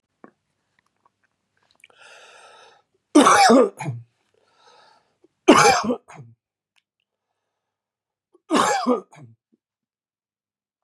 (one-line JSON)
{"three_cough_length": "10.8 s", "three_cough_amplitude": 32707, "three_cough_signal_mean_std_ratio": 0.29, "survey_phase": "beta (2021-08-13 to 2022-03-07)", "age": "45-64", "gender": "Male", "wearing_mask": "No", "symptom_cough_any": true, "symptom_new_continuous_cough": true, "smoker_status": "Ex-smoker", "respiratory_condition_asthma": true, "respiratory_condition_other": false, "recruitment_source": "REACT", "submission_delay": "2 days", "covid_test_result": "Negative", "covid_test_method": "RT-qPCR", "influenza_a_test_result": "Unknown/Void", "influenza_b_test_result": "Unknown/Void"}